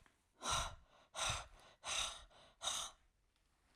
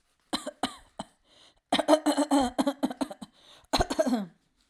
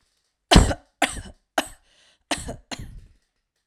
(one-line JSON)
{"exhalation_length": "3.8 s", "exhalation_amplitude": 1681, "exhalation_signal_mean_std_ratio": 0.5, "cough_length": "4.7 s", "cough_amplitude": 14613, "cough_signal_mean_std_ratio": 0.45, "three_cough_length": "3.7 s", "three_cough_amplitude": 32665, "three_cough_signal_mean_std_ratio": 0.27, "survey_phase": "alpha (2021-03-01 to 2021-08-12)", "age": "18-44", "gender": "Female", "wearing_mask": "No", "symptom_none": true, "smoker_status": "Never smoked", "respiratory_condition_asthma": false, "respiratory_condition_other": false, "recruitment_source": "REACT", "submission_delay": "3 days", "covid_test_result": "Negative", "covid_test_method": "RT-qPCR"}